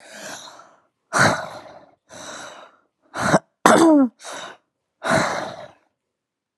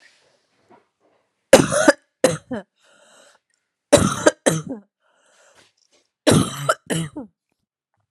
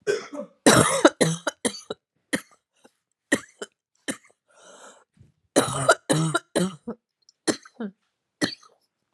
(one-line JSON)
{"exhalation_length": "6.6 s", "exhalation_amplitude": 32768, "exhalation_signal_mean_std_ratio": 0.39, "three_cough_length": "8.1 s", "three_cough_amplitude": 32768, "three_cough_signal_mean_std_ratio": 0.3, "cough_length": "9.1 s", "cough_amplitude": 31116, "cough_signal_mean_std_ratio": 0.35, "survey_phase": "beta (2021-08-13 to 2022-03-07)", "age": "18-44", "gender": "Female", "wearing_mask": "No", "symptom_cough_any": true, "symptom_sore_throat": true, "symptom_fatigue": true, "symptom_fever_high_temperature": true, "symptom_headache": true, "symptom_onset": "4 days", "smoker_status": "Never smoked", "respiratory_condition_asthma": false, "respiratory_condition_other": false, "recruitment_source": "Test and Trace", "submission_delay": "1 day", "covid_test_result": "Positive", "covid_test_method": "RT-qPCR", "covid_ct_value": 35.3, "covid_ct_gene": "N gene"}